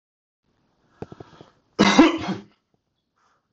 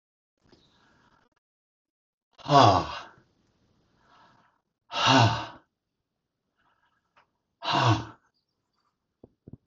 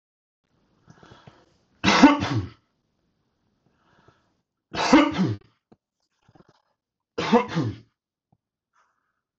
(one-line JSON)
{"cough_length": "3.5 s", "cough_amplitude": 25428, "cough_signal_mean_std_ratio": 0.29, "exhalation_length": "9.7 s", "exhalation_amplitude": 20838, "exhalation_signal_mean_std_ratio": 0.27, "three_cough_length": "9.4 s", "three_cough_amplitude": 25399, "three_cough_signal_mean_std_ratio": 0.29, "survey_phase": "beta (2021-08-13 to 2022-03-07)", "age": "45-64", "gender": "Male", "wearing_mask": "No", "symptom_none": true, "smoker_status": "Never smoked", "respiratory_condition_asthma": false, "respiratory_condition_other": false, "recruitment_source": "REACT", "submission_delay": "1 day", "covid_test_result": "Negative", "covid_test_method": "RT-qPCR", "influenza_a_test_result": "Negative", "influenza_b_test_result": "Negative"}